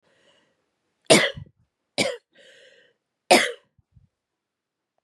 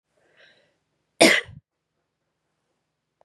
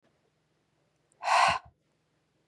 {"three_cough_length": "5.0 s", "three_cough_amplitude": 30761, "three_cough_signal_mean_std_ratio": 0.24, "cough_length": "3.2 s", "cough_amplitude": 31602, "cough_signal_mean_std_ratio": 0.19, "exhalation_length": "2.5 s", "exhalation_amplitude": 9485, "exhalation_signal_mean_std_ratio": 0.3, "survey_phase": "beta (2021-08-13 to 2022-03-07)", "age": "18-44", "gender": "Female", "wearing_mask": "No", "symptom_cough_any": true, "symptom_runny_or_blocked_nose": true, "symptom_sore_throat": true, "symptom_fatigue": true, "symptom_fever_high_temperature": true, "symptom_headache": true, "symptom_onset": "4 days", "smoker_status": "Never smoked", "respiratory_condition_asthma": false, "respiratory_condition_other": false, "recruitment_source": "Test and Trace", "submission_delay": "1 day", "covid_test_result": "Positive", "covid_test_method": "RT-qPCR", "covid_ct_value": 26.0, "covid_ct_gene": "N gene"}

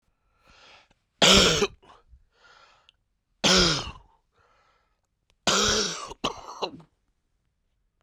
{"three_cough_length": "8.0 s", "three_cough_amplitude": 19568, "three_cough_signal_mean_std_ratio": 0.34, "survey_phase": "beta (2021-08-13 to 2022-03-07)", "age": "45-64", "gender": "Male", "wearing_mask": "No", "symptom_cough_any": true, "symptom_new_continuous_cough": true, "symptom_runny_or_blocked_nose": true, "symptom_sore_throat": true, "symptom_fatigue": true, "symptom_headache": true, "symptom_onset": "3 days", "smoker_status": "Current smoker (e-cigarettes or vapes only)", "respiratory_condition_asthma": false, "respiratory_condition_other": false, "recruitment_source": "Test and Trace", "submission_delay": "1 day", "covid_test_result": "Positive", "covid_test_method": "RT-qPCR", "covid_ct_value": 14.2, "covid_ct_gene": "ORF1ab gene", "covid_ct_mean": 14.6, "covid_viral_load": "17000000 copies/ml", "covid_viral_load_category": "High viral load (>1M copies/ml)"}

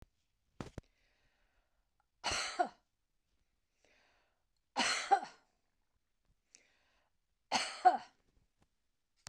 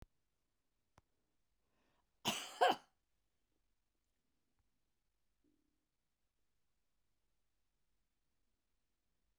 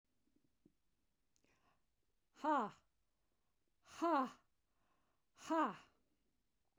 {"three_cough_length": "9.3 s", "three_cough_amplitude": 6916, "three_cough_signal_mean_std_ratio": 0.25, "cough_length": "9.4 s", "cough_amplitude": 3490, "cough_signal_mean_std_ratio": 0.15, "exhalation_length": "6.8 s", "exhalation_amplitude": 1803, "exhalation_signal_mean_std_ratio": 0.3, "survey_phase": "beta (2021-08-13 to 2022-03-07)", "age": "65+", "gender": "Female", "wearing_mask": "No", "symptom_none": true, "smoker_status": "Ex-smoker", "respiratory_condition_asthma": false, "respiratory_condition_other": false, "recruitment_source": "REACT", "submission_delay": "2 days", "covid_test_result": "Negative", "covid_test_method": "RT-qPCR", "influenza_a_test_result": "Negative", "influenza_b_test_result": "Negative"}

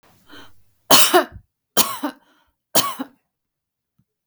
{"three_cough_length": "4.3 s", "three_cough_amplitude": 32768, "three_cough_signal_mean_std_ratio": 0.31, "survey_phase": "beta (2021-08-13 to 2022-03-07)", "age": "45-64", "gender": "Female", "wearing_mask": "No", "symptom_none": true, "smoker_status": "Ex-smoker", "respiratory_condition_asthma": false, "respiratory_condition_other": false, "recruitment_source": "REACT", "submission_delay": "1 day", "covid_test_result": "Negative", "covid_test_method": "RT-qPCR", "influenza_a_test_result": "Negative", "influenza_b_test_result": "Negative"}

